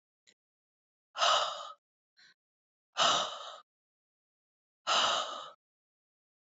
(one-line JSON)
{"exhalation_length": "6.6 s", "exhalation_amplitude": 6740, "exhalation_signal_mean_std_ratio": 0.36, "survey_phase": "alpha (2021-03-01 to 2021-08-12)", "age": "45-64", "gender": "Female", "wearing_mask": "No", "symptom_none": true, "smoker_status": "Never smoked", "respiratory_condition_asthma": false, "respiratory_condition_other": false, "recruitment_source": "REACT", "submission_delay": "1 day", "covid_test_result": "Negative", "covid_test_method": "RT-qPCR"}